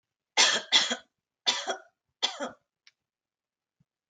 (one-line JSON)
{"three_cough_length": "4.1 s", "three_cough_amplitude": 14876, "three_cough_signal_mean_std_ratio": 0.34, "survey_phase": "beta (2021-08-13 to 2022-03-07)", "age": "18-44", "gender": "Female", "wearing_mask": "No", "symptom_none": true, "smoker_status": "Never smoked", "respiratory_condition_asthma": false, "respiratory_condition_other": false, "recruitment_source": "REACT", "submission_delay": "5 days", "covid_test_result": "Negative", "covid_test_method": "RT-qPCR"}